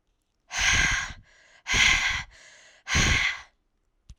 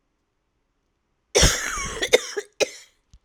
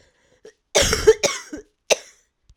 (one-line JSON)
{"exhalation_length": "4.2 s", "exhalation_amplitude": 15241, "exhalation_signal_mean_std_ratio": 0.53, "cough_length": "3.2 s", "cough_amplitude": 32767, "cough_signal_mean_std_ratio": 0.35, "three_cough_length": "2.6 s", "three_cough_amplitude": 29223, "three_cough_signal_mean_std_ratio": 0.35, "survey_phase": "alpha (2021-03-01 to 2021-08-12)", "age": "18-44", "gender": "Female", "wearing_mask": "No", "symptom_cough_any": true, "symptom_new_continuous_cough": true, "symptom_diarrhoea": true, "symptom_fatigue": true, "symptom_fever_high_temperature": true, "symptom_headache": true, "symptom_change_to_sense_of_smell_or_taste": true, "symptom_loss_of_taste": true, "symptom_onset": "2 days", "smoker_status": "Ex-smoker", "respiratory_condition_asthma": false, "respiratory_condition_other": false, "recruitment_source": "Test and Trace", "submission_delay": "1 day", "covid_test_result": "Positive", "covid_test_method": "RT-qPCR", "covid_ct_value": 22.8, "covid_ct_gene": "ORF1ab gene"}